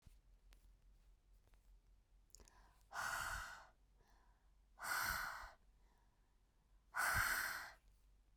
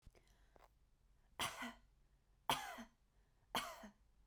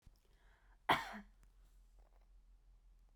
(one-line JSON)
{"exhalation_length": "8.4 s", "exhalation_amplitude": 1519, "exhalation_signal_mean_std_ratio": 0.45, "three_cough_length": "4.3 s", "three_cough_amplitude": 1931, "three_cough_signal_mean_std_ratio": 0.36, "cough_length": "3.2 s", "cough_amplitude": 3581, "cough_signal_mean_std_ratio": 0.26, "survey_phase": "beta (2021-08-13 to 2022-03-07)", "age": "18-44", "gender": "Female", "wearing_mask": "No", "symptom_change_to_sense_of_smell_or_taste": true, "smoker_status": "Never smoked", "respiratory_condition_asthma": false, "respiratory_condition_other": false, "recruitment_source": "REACT", "submission_delay": "2 days", "covid_test_result": "Negative", "covid_test_method": "RT-qPCR"}